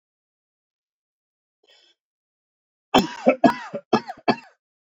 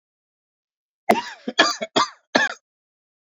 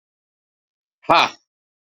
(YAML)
three_cough_length: 4.9 s
three_cough_amplitude: 27643
three_cough_signal_mean_std_ratio: 0.25
cough_length: 3.3 s
cough_amplitude: 29058
cough_signal_mean_std_ratio: 0.32
exhalation_length: 2.0 s
exhalation_amplitude: 31642
exhalation_signal_mean_std_ratio: 0.23
survey_phase: beta (2021-08-13 to 2022-03-07)
age: 45-64
gender: Male
wearing_mask: 'No'
symptom_cough_any: true
symptom_runny_or_blocked_nose: true
symptom_sore_throat: true
symptom_fatigue: true
symptom_fever_high_temperature: true
smoker_status: Never smoked
respiratory_condition_asthma: false
respiratory_condition_other: false
recruitment_source: Test and Trace
submission_delay: 1 day
covid_test_result: Positive
covid_test_method: RT-qPCR
covid_ct_value: 22.5
covid_ct_gene: ORF1ab gene
covid_ct_mean: 23.1
covid_viral_load: 26000 copies/ml
covid_viral_load_category: Low viral load (10K-1M copies/ml)